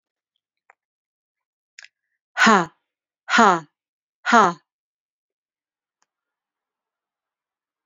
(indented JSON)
{
  "exhalation_length": "7.9 s",
  "exhalation_amplitude": 31149,
  "exhalation_signal_mean_std_ratio": 0.23,
  "survey_phase": "beta (2021-08-13 to 2022-03-07)",
  "age": "18-44",
  "gender": "Female",
  "wearing_mask": "No",
  "symptom_cough_any": true,
  "symptom_runny_or_blocked_nose": true,
  "symptom_sore_throat": true,
  "smoker_status": "Never smoked",
  "respiratory_condition_asthma": false,
  "respiratory_condition_other": false,
  "recruitment_source": "Test and Trace",
  "submission_delay": "2 days",
  "covid_test_result": "Positive",
  "covid_test_method": "RT-qPCR",
  "covid_ct_value": 29.9,
  "covid_ct_gene": "ORF1ab gene"
}